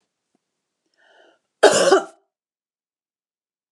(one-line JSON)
{"cough_length": "3.7 s", "cough_amplitude": 32750, "cough_signal_mean_std_ratio": 0.25, "survey_phase": "beta (2021-08-13 to 2022-03-07)", "age": "45-64", "gender": "Female", "wearing_mask": "No", "symptom_none": true, "smoker_status": "Never smoked", "respiratory_condition_asthma": false, "respiratory_condition_other": false, "recruitment_source": "REACT", "submission_delay": "2 days", "covid_test_result": "Negative", "covid_test_method": "RT-qPCR", "influenza_a_test_result": "Negative", "influenza_b_test_result": "Negative"}